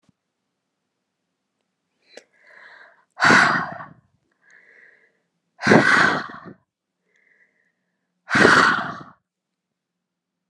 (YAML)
exhalation_length: 10.5 s
exhalation_amplitude: 32683
exhalation_signal_mean_std_ratio: 0.32
survey_phase: alpha (2021-03-01 to 2021-08-12)
age: 18-44
gender: Female
wearing_mask: 'No'
symptom_none: true
smoker_status: Never smoked
respiratory_condition_asthma: false
respiratory_condition_other: false
recruitment_source: REACT
submission_delay: 1 day
covid_test_result: Negative
covid_test_method: RT-qPCR